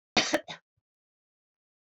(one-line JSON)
{"cough_length": "1.9 s", "cough_amplitude": 10751, "cough_signal_mean_std_ratio": 0.25, "survey_phase": "alpha (2021-03-01 to 2021-08-12)", "age": "45-64", "gender": "Female", "wearing_mask": "No", "symptom_none": true, "smoker_status": "Never smoked", "respiratory_condition_asthma": false, "respiratory_condition_other": false, "recruitment_source": "REACT", "submission_delay": "2 days", "covid_test_result": "Negative", "covid_test_method": "RT-qPCR"}